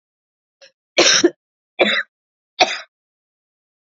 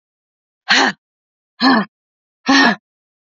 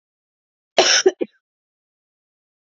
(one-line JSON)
{"three_cough_length": "3.9 s", "three_cough_amplitude": 32077, "three_cough_signal_mean_std_ratio": 0.32, "exhalation_length": "3.3 s", "exhalation_amplitude": 31662, "exhalation_signal_mean_std_ratio": 0.39, "cough_length": "2.6 s", "cough_amplitude": 32767, "cough_signal_mean_std_ratio": 0.27, "survey_phase": "alpha (2021-03-01 to 2021-08-12)", "age": "18-44", "gender": "Female", "wearing_mask": "No", "symptom_fatigue": true, "symptom_fever_high_temperature": true, "symptom_change_to_sense_of_smell_or_taste": true, "symptom_onset": "8 days", "smoker_status": "Ex-smoker", "respiratory_condition_asthma": false, "respiratory_condition_other": false, "recruitment_source": "Test and Trace", "submission_delay": "2 days", "covid_test_result": "Positive", "covid_test_method": "RT-qPCR", "covid_ct_value": 19.7, "covid_ct_gene": "ORF1ab gene", "covid_ct_mean": 20.4, "covid_viral_load": "200000 copies/ml", "covid_viral_load_category": "Low viral load (10K-1M copies/ml)"}